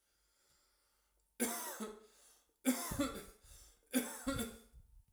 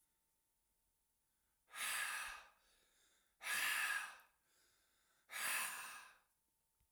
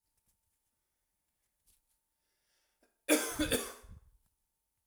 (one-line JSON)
{"three_cough_length": "5.1 s", "three_cough_amplitude": 3406, "three_cough_signal_mean_std_ratio": 0.44, "exhalation_length": "6.9 s", "exhalation_amplitude": 1183, "exhalation_signal_mean_std_ratio": 0.46, "cough_length": "4.9 s", "cough_amplitude": 7739, "cough_signal_mean_std_ratio": 0.25, "survey_phase": "beta (2021-08-13 to 2022-03-07)", "age": "18-44", "gender": "Male", "wearing_mask": "No", "symptom_none": true, "smoker_status": "Never smoked", "respiratory_condition_asthma": false, "respiratory_condition_other": false, "recruitment_source": "REACT", "submission_delay": "2 days", "covid_test_result": "Negative", "covid_test_method": "RT-qPCR"}